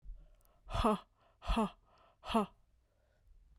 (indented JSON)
{
  "exhalation_length": "3.6 s",
  "exhalation_amplitude": 3541,
  "exhalation_signal_mean_std_ratio": 0.39,
  "survey_phase": "beta (2021-08-13 to 2022-03-07)",
  "age": "18-44",
  "gender": "Female",
  "wearing_mask": "No",
  "symptom_cough_any": true,
  "symptom_runny_or_blocked_nose": true,
  "symptom_fatigue": true,
  "symptom_headache": true,
  "symptom_onset": "3 days",
  "smoker_status": "Ex-smoker",
  "respiratory_condition_asthma": false,
  "respiratory_condition_other": false,
  "recruitment_source": "Test and Trace",
  "submission_delay": "2 days",
  "covid_test_result": "Positive",
  "covid_test_method": "RT-qPCR"
}